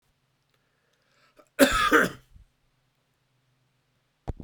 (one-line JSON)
{"cough_length": "4.4 s", "cough_amplitude": 22313, "cough_signal_mean_std_ratio": 0.26, "survey_phase": "beta (2021-08-13 to 2022-03-07)", "age": "65+", "gender": "Male", "wearing_mask": "No", "symptom_sore_throat": true, "smoker_status": "Never smoked", "respiratory_condition_asthma": false, "respiratory_condition_other": false, "recruitment_source": "REACT", "submission_delay": "3 days", "covid_test_result": "Negative", "covid_test_method": "RT-qPCR", "influenza_a_test_result": "Negative", "influenza_b_test_result": "Negative"}